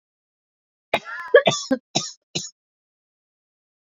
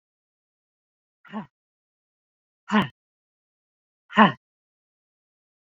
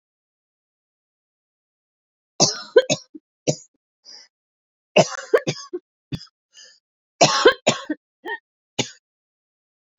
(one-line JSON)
{"cough_length": "3.8 s", "cough_amplitude": 26309, "cough_signal_mean_std_ratio": 0.26, "exhalation_length": "5.7 s", "exhalation_amplitude": 26890, "exhalation_signal_mean_std_ratio": 0.17, "three_cough_length": "10.0 s", "three_cough_amplitude": 31297, "three_cough_signal_mean_std_ratio": 0.26, "survey_phase": "alpha (2021-03-01 to 2021-08-12)", "age": "45-64", "gender": "Female", "wearing_mask": "No", "symptom_cough_any": true, "symptom_new_continuous_cough": true, "symptom_shortness_of_breath": true, "symptom_fatigue": true, "symptom_headache": true, "symptom_change_to_sense_of_smell_or_taste": true, "symptom_loss_of_taste": true, "symptom_onset": "3 days", "smoker_status": "Ex-smoker", "respiratory_condition_asthma": true, "respiratory_condition_other": false, "recruitment_source": "Test and Trace", "submission_delay": "2 days", "covid_test_result": "Positive", "covid_test_method": "RT-qPCR", "covid_ct_value": 32.8, "covid_ct_gene": "N gene", "covid_ct_mean": 33.9, "covid_viral_load": "7.5 copies/ml", "covid_viral_load_category": "Minimal viral load (< 10K copies/ml)"}